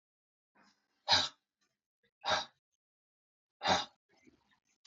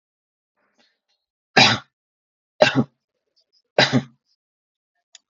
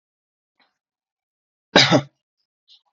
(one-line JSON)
{"exhalation_length": "4.9 s", "exhalation_amplitude": 6748, "exhalation_signal_mean_std_ratio": 0.27, "three_cough_length": "5.3 s", "three_cough_amplitude": 32755, "three_cough_signal_mean_std_ratio": 0.25, "cough_length": "3.0 s", "cough_amplitude": 32755, "cough_signal_mean_std_ratio": 0.22, "survey_phase": "beta (2021-08-13 to 2022-03-07)", "age": "18-44", "gender": "Male", "wearing_mask": "No", "symptom_cough_any": true, "symptom_sore_throat": true, "symptom_onset": "13 days", "smoker_status": "Never smoked", "respiratory_condition_asthma": false, "respiratory_condition_other": false, "recruitment_source": "REACT", "submission_delay": "3 days", "covid_test_result": "Negative", "covid_test_method": "RT-qPCR", "influenza_a_test_result": "Negative", "influenza_b_test_result": "Negative"}